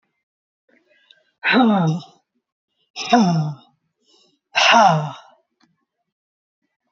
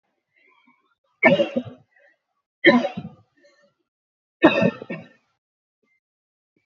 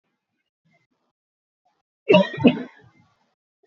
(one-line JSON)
{"exhalation_length": "6.9 s", "exhalation_amplitude": 27660, "exhalation_signal_mean_std_ratio": 0.4, "three_cough_length": "6.7 s", "three_cough_amplitude": 32768, "three_cough_signal_mean_std_ratio": 0.28, "cough_length": "3.7 s", "cough_amplitude": 26180, "cough_signal_mean_std_ratio": 0.24, "survey_phase": "beta (2021-08-13 to 2022-03-07)", "age": "45-64", "gender": "Female", "wearing_mask": "No", "symptom_cough_any": true, "symptom_runny_or_blocked_nose": true, "symptom_headache": true, "smoker_status": "Never smoked", "respiratory_condition_asthma": false, "respiratory_condition_other": false, "recruitment_source": "Test and Trace", "submission_delay": "2 days", "covid_test_result": "Positive", "covid_test_method": "RT-qPCR", "covid_ct_value": 25.0, "covid_ct_gene": "N gene"}